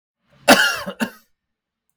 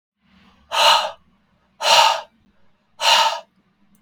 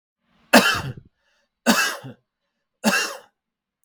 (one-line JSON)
{"cough_length": "2.0 s", "cough_amplitude": 32768, "cough_signal_mean_std_ratio": 0.32, "exhalation_length": "4.0 s", "exhalation_amplitude": 32549, "exhalation_signal_mean_std_ratio": 0.42, "three_cough_length": "3.8 s", "three_cough_amplitude": 32768, "three_cough_signal_mean_std_ratio": 0.35, "survey_phase": "beta (2021-08-13 to 2022-03-07)", "age": "45-64", "gender": "Male", "wearing_mask": "No", "symptom_diarrhoea": true, "symptom_headache": true, "symptom_onset": "12 days", "smoker_status": "Never smoked", "respiratory_condition_asthma": false, "respiratory_condition_other": false, "recruitment_source": "REACT", "submission_delay": "2 days", "covid_test_result": "Negative", "covid_test_method": "RT-qPCR", "influenza_a_test_result": "Negative", "influenza_b_test_result": "Negative"}